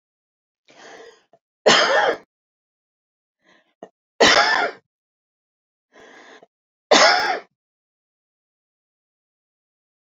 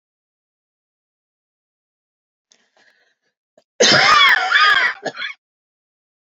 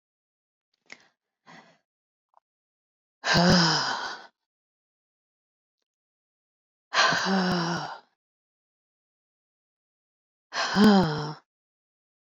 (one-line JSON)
{"three_cough_length": "10.2 s", "three_cough_amplitude": 31951, "three_cough_signal_mean_std_ratio": 0.3, "cough_length": "6.3 s", "cough_amplitude": 32768, "cough_signal_mean_std_ratio": 0.36, "exhalation_length": "12.2 s", "exhalation_amplitude": 14690, "exhalation_signal_mean_std_ratio": 0.35, "survey_phase": "beta (2021-08-13 to 2022-03-07)", "age": "65+", "gender": "Female", "wearing_mask": "No", "symptom_cough_any": true, "smoker_status": "Never smoked", "respiratory_condition_asthma": false, "respiratory_condition_other": false, "recruitment_source": "REACT", "submission_delay": "2 days", "covid_test_result": "Negative", "covid_test_method": "RT-qPCR", "influenza_a_test_result": "Negative", "influenza_b_test_result": "Negative"}